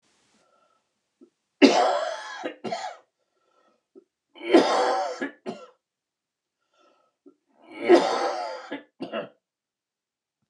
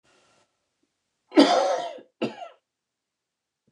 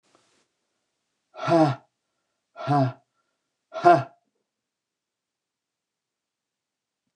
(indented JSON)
{
  "three_cough_length": "10.5 s",
  "three_cough_amplitude": 28448,
  "three_cough_signal_mean_std_ratio": 0.34,
  "cough_length": "3.7 s",
  "cough_amplitude": 23356,
  "cough_signal_mean_std_ratio": 0.3,
  "exhalation_length": "7.2 s",
  "exhalation_amplitude": 26827,
  "exhalation_signal_mean_std_ratio": 0.25,
  "survey_phase": "beta (2021-08-13 to 2022-03-07)",
  "age": "65+",
  "gender": "Male",
  "wearing_mask": "No",
  "symptom_cough_any": true,
  "symptom_shortness_of_breath": true,
  "symptom_headache": true,
  "symptom_other": true,
  "smoker_status": "Ex-smoker",
  "respiratory_condition_asthma": false,
  "respiratory_condition_other": false,
  "recruitment_source": "Test and Trace",
  "submission_delay": "2 days",
  "covid_test_result": "Positive",
  "covid_test_method": "RT-qPCR",
  "covid_ct_value": 20.9,
  "covid_ct_gene": "ORF1ab gene",
  "covid_ct_mean": 21.5,
  "covid_viral_load": "91000 copies/ml",
  "covid_viral_load_category": "Low viral load (10K-1M copies/ml)"
}